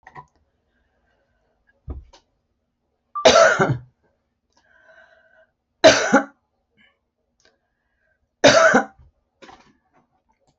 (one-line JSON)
{"three_cough_length": "10.6 s", "three_cough_amplitude": 28941, "three_cough_signal_mean_std_ratio": 0.27, "survey_phase": "alpha (2021-03-01 to 2021-08-12)", "age": "65+", "gender": "Female", "wearing_mask": "No", "symptom_none": true, "smoker_status": "Never smoked", "respiratory_condition_asthma": false, "respiratory_condition_other": false, "recruitment_source": "REACT", "submission_delay": "1 day", "covid_test_result": "Negative", "covid_test_method": "RT-qPCR"}